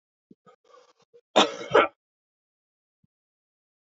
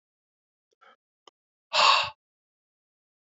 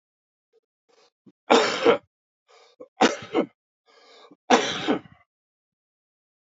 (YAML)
cough_length: 3.9 s
cough_amplitude: 22135
cough_signal_mean_std_ratio: 0.21
exhalation_length: 3.2 s
exhalation_amplitude: 13414
exhalation_signal_mean_std_ratio: 0.25
three_cough_length: 6.6 s
three_cough_amplitude: 26808
three_cough_signal_mean_std_ratio: 0.31
survey_phase: beta (2021-08-13 to 2022-03-07)
age: 45-64
gender: Male
wearing_mask: 'No'
symptom_cough_any: true
symptom_runny_or_blocked_nose: true
symptom_diarrhoea: true
symptom_fatigue: true
symptom_fever_high_temperature: true
symptom_headache: true
symptom_change_to_sense_of_smell_or_taste: true
symptom_loss_of_taste: true
symptom_onset: 5 days
smoker_status: Ex-smoker
respiratory_condition_asthma: false
respiratory_condition_other: false
recruitment_source: Test and Trace
submission_delay: 2 days
covid_test_result: Positive
covid_test_method: RT-qPCR